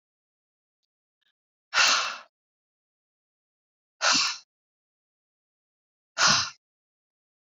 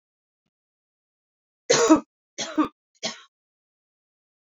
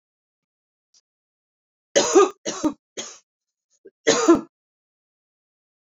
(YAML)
exhalation_length: 7.4 s
exhalation_amplitude: 13690
exhalation_signal_mean_std_ratio: 0.29
three_cough_length: 4.4 s
three_cough_amplitude: 20112
three_cough_signal_mean_std_ratio: 0.26
cough_length: 5.8 s
cough_amplitude: 23938
cough_signal_mean_std_ratio: 0.28
survey_phase: beta (2021-08-13 to 2022-03-07)
age: 45-64
gender: Female
wearing_mask: 'No'
symptom_cough_any: true
symptom_runny_or_blocked_nose: true
symptom_sore_throat: true
symptom_headache: true
smoker_status: Never smoked
respiratory_condition_asthma: false
respiratory_condition_other: false
recruitment_source: Test and Trace
submission_delay: 1 day
covid_test_result: Positive
covid_test_method: ePCR